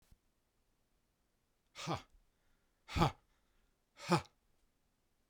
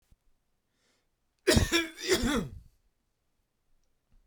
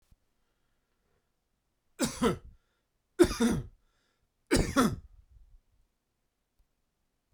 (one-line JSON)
{"exhalation_length": "5.3 s", "exhalation_amplitude": 5195, "exhalation_signal_mean_std_ratio": 0.23, "cough_length": "4.3 s", "cough_amplitude": 10321, "cough_signal_mean_std_ratio": 0.34, "three_cough_length": "7.3 s", "three_cough_amplitude": 11328, "three_cough_signal_mean_std_ratio": 0.29, "survey_phase": "beta (2021-08-13 to 2022-03-07)", "age": "45-64", "gender": "Male", "wearing_mask": "No", "symptom_shortness_of_breath": true, "symptom_onset": "12 days", "smoker_status": "Never smoked", "respiratory_condition_asthma": false, "respiratory_condition_other": false, "recruitment_source": "REACT", "submission_delay": "1 day", "covid_test_result": "Negative", "covid_test_method": "RT-qPCR"}